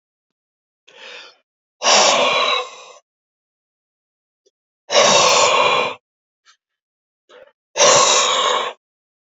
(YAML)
exhalation_length: 9.3 s
exhalation_amplitude: 32768
exhalation_signal_mean_std_ratio: 0.46
survey_phase: beta (2021-08-13 to 2022-03-07)
age: 45-64
gender: Male
wearing_mask: 'No'
symptom_none: true
smoker_status: Never smoked
respiratory_condition_asthma: false
respiratory_condition_other: false
recruitment_source: REACT
submission_delay: 13 days
covid_test_result: Negative
covid_test_method: RT-qPCR
influenza_a_test_result: Negative
influenza_b_test_result: Negative